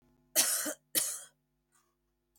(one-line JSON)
{"cough_length": "2.4 s", "cough_amplitude": 8410, "cough_signal_mean_std_ratio": 0.38, "survey_phase": "beta (2021-08-13 to 2022-03-07)", "age": "45-64", "gender": "Female", "wearing_mask": "No", "symptom_runny_or_blocked_nose": true, "symptom_fatigue": true, "symptom_headache": true, "symptom_onset": "4 days", "smoker_status": "Never smoked", "respiratory_condition_asthma": false, "respiratory_condition_other": false, "recruitment_source": "REACT", "submission_delay": "3 days", "covid_test_result": "Negative", "covid_test_method": "RT-qPCR", "influenza_a_test_result": "Negative", "influenza_b_test_result": "Negative"}